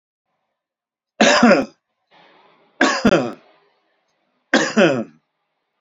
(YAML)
three_cough_length: 5.8 s
three_cough_amplitude: 32767
three_cough_signal_mean_std_ratio: 0.38
survey_phase: beta (2021-08-13 to 2022-03-07)
age: 65+
gender: Male
wearing_mask: 'No'
symptom_none: true
smoker_status: Never smoked
respiratory_condition_asthma: false
respiratory_condition_other: false
recruitment_source: REACT
submission_delay: 2 days
covid_test_result: Negative
covid_test_method: RT-qPCR